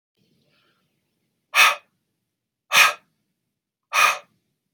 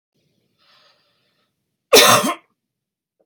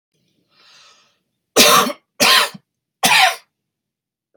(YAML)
exhalation_length: 4.7 s
exhalation_amplitude: 26682
exhalation_signal_mean_std_ratio: 0.28
cough_length: 3.3 s
cough_amplitude: 32767
cough_signal_mean_std_ratio: 0.27
three_cough_length: 4.4 s
three_cough_amplitude: 32768
three_cough_signal_mean_std_ratio: 0.38
survey_phase: beta (2021-08-13 to 2022-03-07)
age: 45-64
gender: Male
wearing_mask: 'No'
symptom_none: true
smoker_status: Never smoked
respiratory_condition_asthma: false
respiratory_condition_other: false
recruitment_source: Test and Trace
submission_delay: 1 day
covid_test_result: Negative
covid_test_method: RT-qPCR